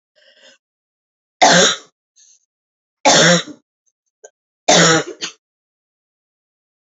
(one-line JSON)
{"three_cough_length": "6.8 s", "three_cough_amplitude": 31895, "three_cough_signal_mean_std_ratio": 0.34, "survey_phase": "beta (2021-08-13 to 2022-03-07)", "age": "18-44", "gender": "Female", "wearing_mask": "No", "symptom_cough_any": true, "symptom_runny_or_blocked_nose": true, "symptom_abdominal_pain": true, "symptom_fatigue": true, "smoker_status": "Current smoker (11 or more cigarettes per day)", "respiratory_condition_asthma": false, "respiratory_condition_other": false, "recruitment_source": "Test and Trace", "submission_delay": "1 day", "covid_test_result": "Positive", "covid_test_method": "ePCR"}